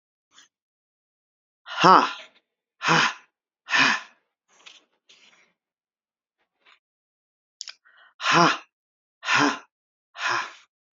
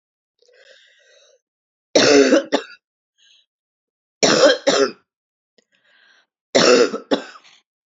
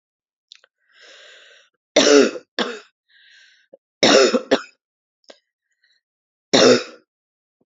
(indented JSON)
{
  "exhalation_length": "10.9 s",
  "exhalation_amplitude": 32191,
  "exhalation_signal_mean_std_ratio": 0.3,
  "three_cough_length": "7.9 s",
  "three_cough_amplitude": 30167,
  "three_cough_signal_mean_std_ratio": 0.37,
  "cough_length": "7.7 s",
  "cough_amplitude": 31062,
  "cough_signal_mean_std_ratio": 0.31,
  "survey_phase": "beta (2021-08-13 to 2022-03-07)",
  "age": "45-64",
  "gender": "Female",
  "wearing_mask": "No",
  "symptom_cough_any": true,
  "symptom_new_continuous_cough": true,
  "symptom_runny_or_blocked_nose": true,
  "symptom_shortness_of_breath": true,
  "symptom_sore_throat": true,
  "symptom_fatigue": true,
  "symptom_headache": true,
  "symptom_change_to_sense_of_smell_or_taste": true,
  "symptom_onset": "2 days",
  "smoker_status": "Current smoker (1 to 10 cigarettes per day)",
  "respiratory_condition_asthma": false,
  "respiratory_condition_other": false,
  "recruitment_source": "Test and Trace",
  "submission_delay": "1 day",
  "covid_test_result": "Positive",
  "covid_test_method": "RT-qPCR",
  "covid_ct_value": 30.0,
  "covid_ct_gene": "N gene"
}